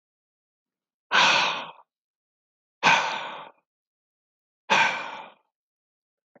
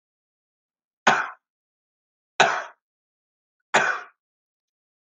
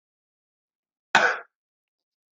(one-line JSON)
{"exhalation_length": "6.4 s", "exhalation_amplitude": 22608, "exhalation_signal_mean_std_ratio": 0.35, "three_cough_length": "5.1 s", "three_cough_amplitude": 24018, "three_cough_signal_mean_std_ratio": 0.26, "cough_length": "2.4 s", "cough_amplitude": 25989, "cough_signal_mean_std_ratio": 0.22, "survey_phase": "alpha (2021-03-01 to 2021-08-12)", "age": "18-44", "gender": "Male", "wearing_mask": "No", "symptom_none": true, "smoker_status": "Never smoked", "respiratory_condition_asthma": true, "respiratory_condition_other": false, "recruitment_source": "REACT", "submission_delay": "3 days", "covid_test_result": "Negative", "covid_test_method": "RT-qPCR"}